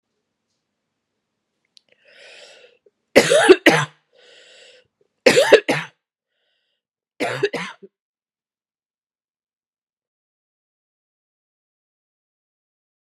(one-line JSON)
{"three_cough_length": "13.1 s", "three_cough_amplitude": 32768, "three_cough_signal_mean_std_ratio": 0.22, "survey_phase": "beta (2021-08-13 to 2022-03-07)", "age": "45-64", "gender": "Female", "wearing_mask": "No", "symptom_cough_any": true, "symptom_runny_or_blocked_nose": true, "symptom_sore_throat": true, "symptom_fatigue": true, "symptom_headache": true, "symptom_other": true, "symptom_onset": "4 days", "smoker_status": "Never smoked", "respiratory_condition_asthma": false, "respiratory_condition_other": false, "recruitment_source": "Test and Trace", "submission_delay": "2 days", "covid_test_result": "Positive", "covid_test_method": "RT-qPCR", "covid_ct_value": 29.8, "covid_ct_gene": "ORF1ab gene", "covid_ct_mean": 30.3, "covid_viral_load": "120 copies/ml", "covid_viral_load_category": "Minimal viral load (< 10K copies/ml)"}